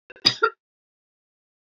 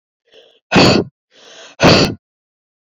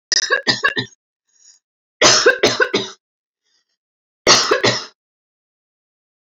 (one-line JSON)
{"cough_length": "1.8 s", "cough_amplitude": 30187, "cough_signal_mean_std_ratio": 0.21, "exhalation_length": "3.0 s", "exhalation_amplitude": 32768, "exhalation_signal_mean_std_ratio": 0.39, "three_cough_length": "6.3 s", "three_cough_amplitude": 31872, "three_cough_signal_mean_std_ratio": 0.4, "survey_phase": "beta (2021-08-13 to 2022-03-07)", "age": "45-64", "gender": "Female", "wearing_mask": "No", "symptom_none": true, "smoker_status": "Never smoked", "respiratory_condition_asthma": false, "respiratory_condition_other": false, "recruitment_source": "REACT", "submission_delay": "2 days", "covid_test_result": "Negative", "covid_test_method": "RT-qPCR"}